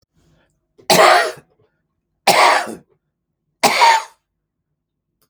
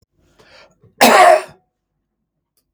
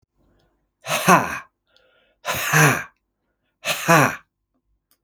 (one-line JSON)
{"three_cough_length": "5.3 s", "three_cough_amplitude": 32768, "three_cough_signal_mean_std_ratio": 0.38, "cough_length": "2.7 s", "cough_amplitude": 32768, "cough_signal_mean_std_ratio": 0.32, "exhalation_length": "5.0 s", "exhalation_amplitude": 32766, "exhalation_signal_mean_std_ratio": 0.38, "survey_phase": "beta (2021-08-13 to 2022-03-07)", "age": "65+", "gender": "Male", "wearing_mask": "No", "symptom_none": true, "smoker_status": "Never smoked", "respiratory_condition_asthma": false, "respiratory_condition_other": false, "recruitment_source": "REACT", "submission_delay": "2 days", "covid_test_result": "Negative", "covid_test_method": "RT-qPCR", "influenza_a_test_result": "Negative", "influenza_b_test_result": "Negative"}